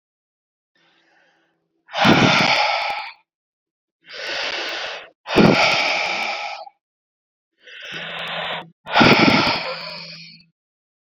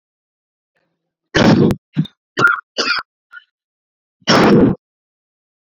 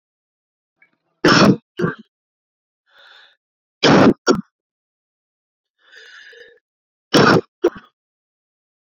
{"exhalation_length": "11.1 s", "exhalation_amplitude": 28033, "exhalation_signal_mean_std_ratio": 0.48, "cough_length": "5.7 s", "cough_amplitude": 30770, "cough_signal_mean_std_ratio": 0.4, "three_cough_length": "8.9 s", "three_cough_amplitude": 28893, "three_cough_signal_mean_std_ratio": 0.3, "survey_phase": "beta (2021-08-13 to 2022-03-07)", "age": "45-64", "gender": "Male", "wearing_mask": "No", "symptom_cough_any": true, "symptom_fatigue": true, "symptom_change_to_sense_of_smell_or_taste": true, "symptom_onset": "2 days", "smoker_status": "Current smoker (11 or more cigarettes per day)", "respiratory_condition_asthma": false, "respiratory_condition_other": false, "recruitment_source": "Test and Trace", "submission_delay": "2 days", "covid_test_result": "Positive", "covid_test_method": "RT-qPCR", "covid_ct_value": 19.8, "covid_ct_gene": "ORF1ab gene", "covid_ct_mean": 20.1, "covid_viral_load": "250000 copies/ml", "covid_viral_load_category": "Low viral load (10K-1M copies/ml)"}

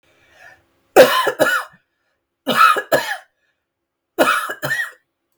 {"three_cough_length": "5.4 s", "three_cough_amplitude": 32768, "three_cough_signal_mean_std_ratio": 0.41, "survey_phase": "beta (2021-08-13 to 2022-03-07)", "age": "45-64", "gender": "Female", "wearing_mask": "No", "symptom_none": true, "symptom_onset": "13 days", "smoker_status": "Ex-smoker", "respiratory_condition_asthma": false, "respiratory_condition_other": false, "recruitment_source": "REACT", "submission_delay": "9 days", "covid_test_result": "Negative", "covid_test_method": "RT-qPCR"}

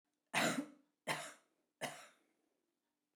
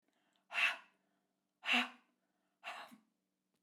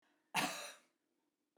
{"three_cough_length": "3.2 s", "three_cough_amplitude": 3019, "three_cough_signal_mean_std_ratio": 0.35, "exhalation_length": "3.6 s", "exhalation_amplitude": 2920, "exhalation_signal_mean_std_ratio": 0.31, "cough_length": "1.6 s", "cough_amplitude": 2555, "cough_signal_mean_std_ratio": 0.35, "survey_phase": "beta (2021-08-13 to 2022-03-07)", "age": "65+", "gender": "Female", "wearing_mask": "No", "symptom_none": true, "smoker_status": "Never smoked", "respiratory_condition_asthma": true, "respiratory_condition_other": false, "recruitment_source": "REACT", "submission_delay": "1 day", "covid_test_result": "Negative", "covid_test_method": "RT-qPCR"}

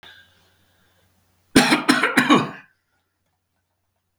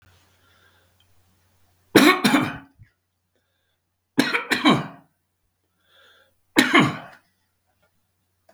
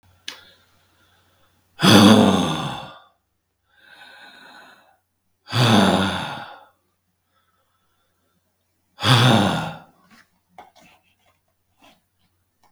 {"cough_length": "4.2 s", "cough_amplitude": 32768, "cough_signal_mean_std_ratio": 0.34, "three_cough_length": "8.5 s", "three_cough_amplitude": 32768, "three_cough_signal_mean_std_ratio": 0.3, "exhalation_length": "12.7 s", "exhalation_amplitude": 32768, "exhalation_signal_mean_std_ratio": 0.33, "survey_phase": "beta (2021-08-13 to 2022-03-07)", "age": "65+", "gender": "Male", "wearing_mask": "No", "symptom_new_continuous_cough": true, "symptom_runny_or_blocked_nose": true, "symptom_onset": "12 days", "smoker_status": "Ex-smoker", "respiratory_condition_asthma": false, "respiratory_condition_other": false, "recruitment_source": "REACT", "submission_delay": "2 days", "covid_test_result": "Negative", "covid_test_method": "RT-qPCR", "influenza_a_test_result": "Negative", "influenza_b_test_result": "Negative"}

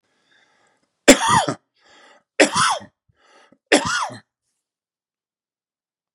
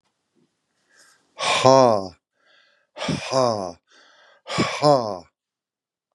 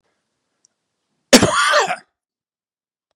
{"three_cough_length": "6.1 s", "three_cough_amplitude": 32768, "three_cough_signal_mean_std_ratio": 0.29, "exhalation_length": "6.1 s", "exhalation_amplitude": 32583, "exhalation_signal_mean_std_ratio": 0.36, "cough_length": "3.2 s", "cough_amplitude": 32768, "cough_signal_mean_std_ratio": 0.31, "survey_phase": "beta (2021-08-13 to 2022-03-07)", "age": "65+", "gender": "Male", "wearing_mask": "No", "symptom_none": true, "smoker_status": "Ex-smoker", "respiratory_condition_asthma": false, "respiratory_condition_other": false, "recruitment_source": "REACT", "submission_delay": "2 days", "covid_test_result": "Negative", "covid_test_method": "RT-qPCR", "influenza_a_test_result": "Negative", "influenza_b_test_result": "Negative"}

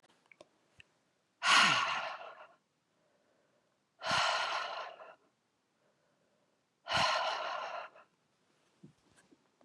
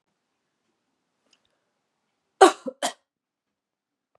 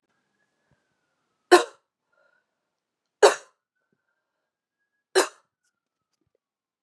{"exhalation_length": "9.6 s", "exhalation_amplitude": 7589, "exhalation_signal_mean_std_ratio": 0.39, "cough_length": "4.2 s", "cough_amplitude": 31871, "cough_signal_mean_std_ratio": 0.14, "three_cough_length": "6.8 s", "three_cough_amplitude": 29970, "three_cough_signal_mean_std_ratio": 0.16, "survey_phase": "beta (2021-08-13 to 2022-03-07)", "age": "45-64", "gender": "Female", "wearing_mask": "No", "symptom_runny_or_blocked_nose": true, "symptom_fatigue": true, "symptom_headache": true, "symptom_loss_of_taste": true, "symptom_onset": "5 days", "smoker_status": "Never smoked", "respiratory_condition_asthma": false, "respiratory_condition_other": false, "recruitment_source": "Test and Trace", "submission_delay": "1 day", "covid_test_result": "Positive", "covid_test_method": "RT-qPCR", "covid_ct_value": 16.6, "covid_ct_gene": "N gene", "covid_ct_mean": 17.8, "covid_viral_load": "1500000 copies/ml", "covid_viral_load_category": "High viral load (>1M copies/ml)"}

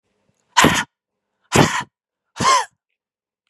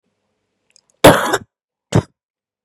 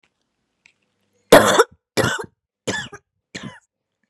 {"exhalation_length": "3.5 s", "exhalation_amplitude": 32607, "exhalation_signal_mean_std_ratio": 0.36, "cough_length": "2.6 s", "cough_amplitude": 32768, "cough_signal_mean_std_ratio": 0.27, "three_cough_length": "4.1 s", "three_cough_amplitude": 32768, "three_cough_signal_mean_std_ratio": 0.28, "survey_phase": "beta (2021-08-13 to 2022-03-07)", "age": "18-44", "gender": "Female", "wearing_mask": "No", "symptom_cough_any": true, "symptom_runny_or_blocked_nose": true, "symptom_onset": "12 days", "smoker_status": "Never smoked", "respiratory_condition_asthma": true, "respiratory_condition_other": false, "recruitment_source": "REACT", "submission_delay": "2 days", "covid_test_result": "Negative", "covid_test_method": "RT-qPCR", "covid_ct_value": 39.0, "covid_ct_gene": "N gene", "influenza_a_test_result": "Negative", "influenza_b_test_result": "Negative"}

